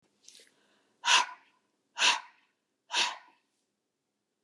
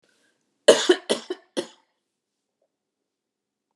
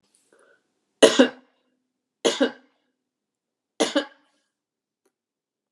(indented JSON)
{
  "exhalation_length": "4.4 s",
  "exhalation_amplitude": 11095,
  "exhalation_signal_mean_std_ratio": 0.29,
  "cough_length": "3.8 s",
  "cough_amplitude": 31779,
  "cough_signal_mean_std_ratio": 0.21,
  "three_cough_length": "5.7 s",
  "three_cough_amplitude": 32617,
  "three_cough_signal_mean_std_ratio": 0.22,
  "survey_phase": "beta (2021-08-13 to 2022-03-07)",
  "age": "65+",
  "gender": "Female",
  "wearing_mask": "No",
  "symptom_none": true,
  "smoker_status": "Ex-smoker",
  "respiratory_condition_asthma": false,
  "respiratory_condition_other": false,
  "recruitment_source": "REACT",
  "submission_delay": "2 days",
  "covid_test_result": "Negative",
  "covid_test_method": "RT-qPCR"
}